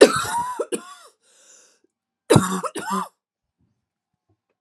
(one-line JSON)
{"cough_length": "4.6 s", "cough_amplitude": 32768, "cough_signal_mean_std_ratio": 0.31, "survey_phase": "alpha (2021-03-01 to 2021-08-12)", "age": "45-64", "gender": "Female", "wearing_mask": "No", "symptom_cough_any": true, "symptom_shortness_of_breath": true, "symptom_fatigue": true, "symptom_change_to_sense_of_smell_or_taste": true, "symptom_onset": "4 days", "smoker_status": "Ex-smoker", "respiratory_condition_asthma": false, "respiratory_condition_other": false, "recruitment_source": "Test and Trace", "submission_delay": "2 days", "covid_test_result": "Positive", "covid_test_method": "RT-qPCR"}